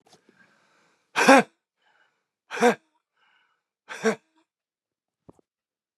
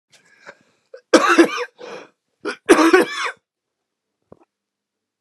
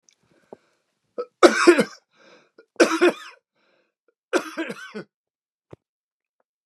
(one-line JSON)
{"exhalation_length": "6.0 s", "exhalation_amplitude": 28901, "exhalation_signal_mean_std_ratio": 0.21, "cough_length": "5.2 s", "cough_amplitude": 32768, "cough_signal_mean_std_ratio": 0.33, "three_cough_length": "6.7 s", "three_cough_amplitude": 32768, "three_cough_signal_mean_std_ratio": 0.27, "survey_phase": "beta (2021-08-13 to 2022-03-07)", "age": "45-64", "gender": "Male", "wearing_mask": "No", "symptom_cough_any": true, "symptom_new_continuous_cough": true, "symptom_sore_throat": true, "symptom_fatigue": true, "symptom_headache": true, "symptom_change_to_sense_of_smell_or_taste": true, "symptom_onset": "4 days", "smoker_status": "Never smoked", "respiratory_condition_asthma": false, "respiratory_condition_other": true, "recruitment_source": "Test and Trace", "submission_delay": "3 days", "covid_test_result": "Positive", "covid_test_method": "RT-qPCR"}